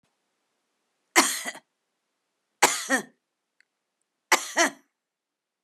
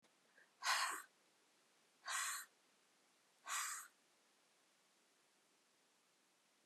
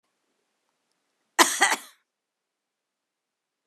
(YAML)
three_cough_length: 5.6 s
three_cough_amplitude: 32668
three_cough_signal_mean_std_ratio: 0.27
exhalation_length: 6.7 s
exhalation_amplitude: 1579
exhalation_signal_mean_std_ratio: 0.35
cough_length: 3.7 s
cough_amplitude: 27240
cough_signal_mean_std_ratio: 0.21
survey_phase: beta (2021-08-13 to 2022-03-07)
age: 65+
gender: Female
wearing_mask: 'No'
symptom_none: true
smoker_status: Never smoked
respiratory_condition_asthma: false
respiratory_condition_other: false
recruitment_source: REACT
submission_delay: 1 day
covid_test_result: Negative
covid_test_method: RT-qPCR
influenza_a_test_result: Unknown/Void
influenza_b_test_result: Unknown/Void